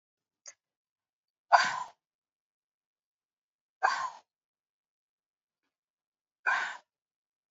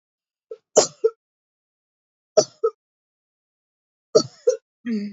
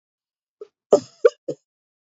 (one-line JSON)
{"exhalation_length": "7.5 s", "exhalation_amplitude": 14697, "exhalation_signal_mean_std_ratio": 0.22, "three_cough_length": "5.1 s", "three_cough_amplitude": 26881, "three_cough_signal_mean_std_ratio": 0.25, "cough_length": "2.0 s", "cough_amplitude": 27030, "cough_signal_mean_std_ratio": 0.19, "survey_phase": "beta (2021-08-13 to 2022-03-07)", "age": "45-64", "gender": "Female", "wearing_mask": "No", "symptom_none": true, "smoker_status": "Never smoked", "respiratory_condition_asthma": true, "respiratory_condition_other": false, "recruitment_source": "REACT", "submission_delay": "1 day", "covid_test_result": "Negative", "covid_test_method": "RT-qPCR", "influenza_a_test_result": "Negative", "influenza_b_test_result": "Negative"}